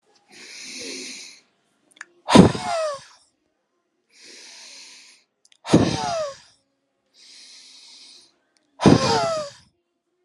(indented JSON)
{
  "exhalation_length": "10.2 s",
  "exhalation_amplitude": 32768,
  "exhalation_signal_mean_std_ratio": 0.3,
  "survey_phase": "alpha (2021-03-01 to 2021-08-12)",
  "age": "18-44",
  "gender": "Male",
  "wearing_mask": "No",
  "symptom_none": true,
  "smoker_status": "Never smoked",
  "respiratory_condition_asthma": false,
  "respiratory_condition_other": false,
  "recruitment_source": "REACT",
  "submission_delay": "1 day",
  "covid_test_result": "Negative",
  "covid_test_method": "RT-qPCR"
}